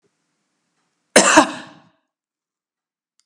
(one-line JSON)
{"cough_length": "3.3 s", "cough_amplitude": 32768, "cough_signal_mean_std_ratio": 0.24, "survey_phase": "beta (2021-08-13 to 2022-03-07)", "age": "65+", "gender": "Female", "wearing_mask": "No", "symptom_none": true, "smoker_status": "Never smoked", "respiratory_condition_asthma": true, "respiratory_condition_other": false, "recruitment_source": "REACT", "submission_delay": "2 days", "covid_test_result": "Negative", "covid_test_method": "RT-qPCR", "influenza_a_test_result": "Negative", "influenza_b_test_result": "Negative"}